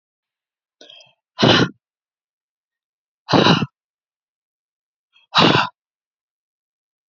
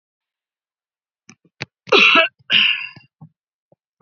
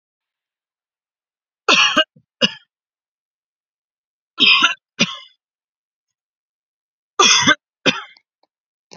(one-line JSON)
{"exhalation_length": "7.1 s", "exhalation_amplitude": 32768, "exhalation_signal_mean_std_ratio": 0.29, "cough_length": "4.0 s", "cough_amplitude": 32768, "cough_signal_mean_std_ratio": 0.33, "three_cough_length": "9.0 s", "three_cough_amplitude": 32767, "three_cough_signal_mean_std_ratio": 0.3, "survey_phase": "beta (2021-08-13 to 2022-03-07)", "age": "18-44", "gender": "Female", "wearing_mask": "No", "symptom_none": true, "smoker_status": "Never smoked", "respiratory_condition_asthma": true, "respiratory_condition_other": false, "recruitment_source": "REACT", "submission_delay": "1 day", "covid_test_result": "Negative", "covid_test_method": "RT-qPCR", "influenza_a_test_result": "Negative", "influenza_b_test_result": "Negative"}